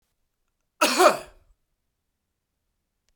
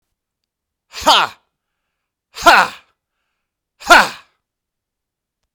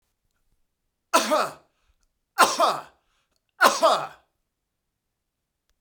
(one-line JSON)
{"cough_length": "3.2 s", "cough_amplitude": 22951, "cough_signal_mean_std_ratio": 0.24, "exhalation_length": "5.5 s", "exhalation_amplitude": 32768, "exhalation_signal_mean_std_ratio": 0.26, "three_cough_length": "5.8 s", "three_cough_amplitude": 28689, "three_cough_signal_mean_std_ratio": 0.32, "survey_phase": "beta (2021-08-13 to 2022-03-07)", "age": "45-64", "gender": "Male", "wearing_mask": "No", "symptom_cough_any": true, "symptom_runny_or_blocked_nose": true, "symptom_sore_throat": true, "symptom_onset": "3 days", "smoker_status": "Ex-smoker", "respiratory_condition_asthma": false, "respiratory_condition_other": false, "recruitment_source": "REACT", "submission_delay": "1 day", "covid_test_result": "Negative", "covid_test_method": "RT-qPCR"}